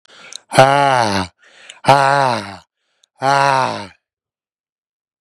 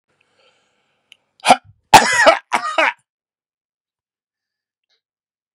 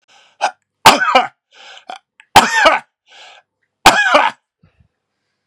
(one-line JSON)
{"exhalation_length": "5.2 s", "exhalation_amplitude": 32768, "exhalation_signal_mean_std_ratio": 0.44, "cough_length": "5.5 s", "cough_amplitude": 32768, "cough_signal_mean_std_ratio": 0.27, "three_cough_length": "5.5 s", "three_cough_amplitude": 32768, "three_cough_signal_mean_std_ratio": 0.38, "survey_phase": "beta (2021-08-13 to 2022-03-07)", "age": "18-44", "gender": "Male", "wearing_mask": "No", "symptom_sore_throat": true, "symptom_onset": "6 days", "smoker_status": "Ex-smoker", "respiratory_condition_asthma": true, "respiratory_condition_other": false, "recruitment_source": "REACT", "submission_delay": "4 days", "covid_test_result": "Negative", "covid_test_method": "RT-qPCR", "influenza_a_test_result": "Negative", "influenza_b_test_result": "Negative"}